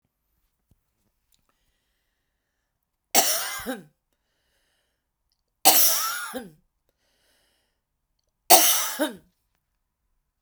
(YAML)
three_cough_length: 10.4 s
three_cough_amplitude: 32768
three_cough_signal_mean_std_ratio: 0.27
survey_phase: beta (2021-08-13 to 2022-03-07)
age: 45-64
gender: Female
wearing_mask: 'No'
symptom_none: true
smoker_status: Ex-smoker
respiratory_condition_asthma: false
respiratory_condition_other: false
recruitment_source: REACT
submission_delay: 1 day
covid_test_result: Negative
covid_test_method: RT-qPCR